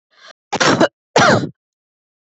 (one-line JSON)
{"cough_length": "2.2 s", "cough_amplitude": 29127, "cough_signal_mean_std_ratio": 0.43, "survey_phase": "beta (2021-08-13 to 2022-03-07)", "age": "18-44", "gender": "Female", "wearing_mask": "No", "symptom_none": true, "smoker_status": "Never smoked", "respiratory_condition_asthma": false, "respiratory_condition_other": false, "recruitment_source": "REACT", "submission_delay": "1 day", "covid_test_result": "Negative", "covid_test_method": "RT-qPCR"}